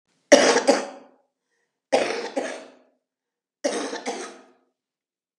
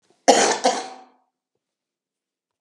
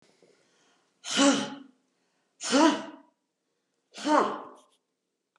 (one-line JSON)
{"three_cough_length": "5.4 s", "three_cough_amplitude": 32768, "three_cough_signal_mean_std_ratio": 0.35, "cough_length": "2.6 s", "cough_amplitude": 32720, "cough_signal_mean_std_ratio": 0.32, "exhalation_length": "5.4 s", "exhalation_amplitude": 13438, "exhalation_signal_mean_std_ratio": 0.36, "survey_phase": "beta (2021-08-13 to 2022-03-07)", "age": "65+", "gender": "Female", "wearing_mask": "No", "symptom_none": true, "smoker_status": "Current smoker (11 or more cigarettes per day)", "respiratory_condition_asthma": false, "respiratory_condition_other": false, "recruitment_source": "REACT", "submission_delay": "2 days", "covid_test_result": "Negative", "covid_test_method": "RT-qPCR", "influenza_a_test_result": "Negative", "influenza_b_test_result": "Negative"}